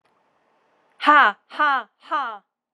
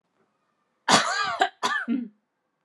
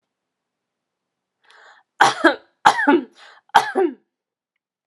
{"exhalation_length": "2.7 s", "exhalation_amplitude": 28977, "exhalation_signal_mean_std_ratio": 0.36, "cough_length": "2.6 s", "cough_amplitude": 23900, "cough_signal_mean_std_ratio": 0.46, "three_cough_length": "4.9 s", "three_cough_amplitude": 32768, "three_cough_signal_mean_std_ratio": 0.31, "survey_phase": "alpha (2021-03-01 to 2021-08-12)", "age": "18-44", "gender": "Female", "wearing_mask": "No", "symptom_none": true, "smoker_status": "Never smoked", "respiratory_condition_asthma": false, "respiratory_condition_other": false, "recruitment_source": "REACT", "submission_delay": "1 day", "covid_test_result": "Negative", "covid_test_method": "RT-qPCR"}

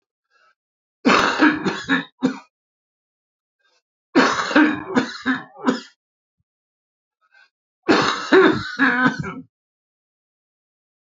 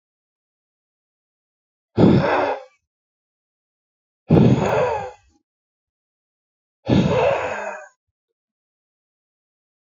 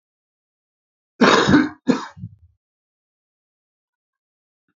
{"three_cough_length": "11.2 s", "three_cough_amplitude": 27943, "three_cough_signal_mean_std_ratio": 0.42, "exhalation_length": "10.0 s", "exhalation_amplitude": 26312, "exhalation_signal_mean_std_ratio": 0.36, "cough_length": "4.8 s", "cough_amplitude": 27377, "cough_signal_mean_std_ratio": 0.28, "survey_phase": "beta (2021-08-13 to 2022-03-07)", "age": "45-64", "gender": "Male", "wearing_mask": "No", "symptom_cough_any": true, "symptom_runny_or_blocked_nose": true, "symptom_headache": true, "symptom_onset": "5 days", "smoker_status": "Current smoker (11 or more cigarettes per day)", "respiratory_condition_asthma": false, "respiratory_condition_other": false, "recruitment_source": "Test and Trace", "submission_delay": "1 day", "covid_test_result": "Positive", "covid_test_method": "RT-qPCR", "covid_ct_value": 20.3, "covid_ct_gene": "ORF1ab gene", "covid_ct_mean": 20.5, "covid_viral_load": "190000 copies/ml", "covid_viral_load_category": "Low viral load (10K-1M copies/ml)"}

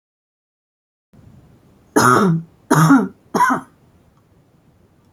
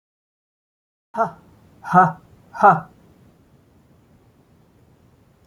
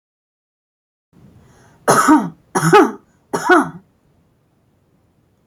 {"three_cough_length": "5.1 s", "three_cough_amplitude": 32768, "three_cough_signal_mean_std_ratio": 0.38, "exhalation_length": "5.5 s", "exhalation_amplitude": 29484, "exhalation_signal_mean_std_ratio": 0.25, "cough_length": "5.5 s", "cough_amplitude": 32358, "cough_signal_mean_std_ratio": 0.35, "survey_phase": "alpha (2021-03-01 to 2021-08-12)", "age": "45-64", "gender": "Female", "wearing_mask": "No", "symptom_none": true, "smoker_status": "Ex-smoker", "respiratory_condition_asthma": true, "respiratory_condition_other": false, "recruitment_source": "REACT", "submission_delay": "1 day", "covid_test_result": "Negative", "covid_test_method": "RT-qPCR"}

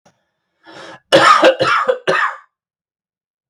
{"three_cough_length": "3.5 s", "three_cough_amplitude": 32768, "three_cough_signal_mean_std_ratio": 0.45, "survey_phase": "beta (2021-08-13 to 2022-03-07)", "age": "18-44", "gender": "Male", "wearing_mask": "No", "symptom_none": true, "smoker_status": "Never smoked", "respiratory_condition_asthma": false, "respiratory_condition_other": false, "recruitment_source": "REACT", "submission_delay": "1 day", "covid_test_result": "Negative", "covid_test_method": "RT-qPCR", "influenza_a_test_result": "Negative", "influenza_b_test_result": "Negative"}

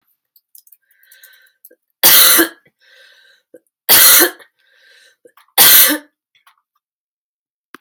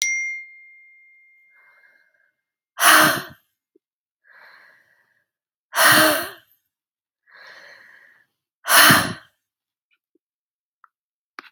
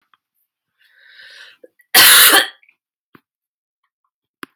{"three_cough_length": "7.8 s", "three_cough_amplitude": 32768, "three_cough_signal_mean_std_ratio": 0.34, "exhalation_length": "11.5 s", "exhalation_amplitude": 32768, "exhalation_signal_mean_std_ratio": 0.3, "cough_length": "4.6 s", "cough_amplitude": 32768, "cough_signal_mean_std_ratio": 0.29, "survey_phase": "alpha (2021-03-01 to 2021-08-12)", "age": "18-44", "gender": "Female", "wearing_mask": "No", "symptom_shortness_of_breath": true, "symptom_fatigue": true, "symptom_change_to_sense_of_smell_or_taste": true, "symptom_loss_of_taste": true, "symptom_onset": "4 days", "smoker_status": "Never smoked", "respiratory_condition_asthma": true, "respiratory_condition_other": false, "recruitment_source": "Test and Trace", "submission_delay": "2 days", "covid_test_result": "Positive", "covid_test_method": "RT-qPCR", "covid_ct_value": 23.1, "covid_ct_gene": "ORF1ab gene", "covid_ct_mean": 24.3, "covid_viral_load": "11000 copies/ml", "covid_viral_load_category": "Low viral load (10K-1M copies/ml)"}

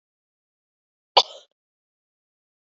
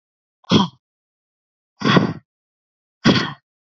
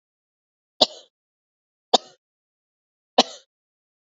{"cough_length": "2.6 s", "cough_amplitude": 29624, "cough_signal_mean_std_ratio": 0.11, "exhalation_length": "3.8 s", "exhalation_amplitude": 27557, "exhalation_signal_mean_std_ratio": 0.33, "three_cough_length": "4.0 s", "three_cough_amplitude": 32767, "three_cough_signal_mean_std_ratio": 0.14, "survey_phase": "alpha (2021-03-01 to 2021-08-12)", "age": "18-44", "gender": "Female", "wearing_mask": "No", "symptom_cough_any": true, "symptom_diarrhoea": true, "symptom_fatigue": true, "symptom_fever_high_temperature": true, "symptom_headache": true, "symptom_change_to_sense_of_smell_or_taste": true, "symptom_loss_of_taste": true, "smoker_status": "Ex-smoker", "respiratory_condition_asthma": false, "respiratory_condition_other": false, "recruitment_source": "Test and Trace", "submission_delay": "2 days", "covid_test_result": "Positive", "covid_test_method": "RT-qPCR", "covid_ct_value": 25.4, "covid_ct_gene": "ORF1ab gene"}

